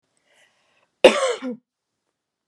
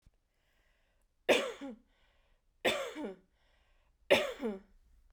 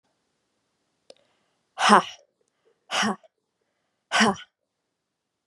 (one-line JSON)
{"cough_length": "2.5 s", "cough_amplitude": 32768, "cough_signal_mean_std_ratio": 0.24, "three_cough_length": "5.1 s", "three_cough_amplitude": 8911, "three_cough_signal_mean_std_ratio": 0.33, "exhalation_length": "5.5 s", "exhalation_amplitude": 31669, "exhalation_signal_mean_std_ratio": 0.25, "survey_phase": "beta (2021-08-13 to 2022-03-07)", "age": "18-44", "gender": "Female", "wearing_mask": "No", "symptom_none": true, "smoker_status": "Ex-smoker", "respiratory_condition_asthma": false, "respiratory_condition_other": false, "recruitment_source": "REACT", "submission_delay": "1 day", "covid_test_result": "Negative", "covid_test_method": "RT-qPCR"}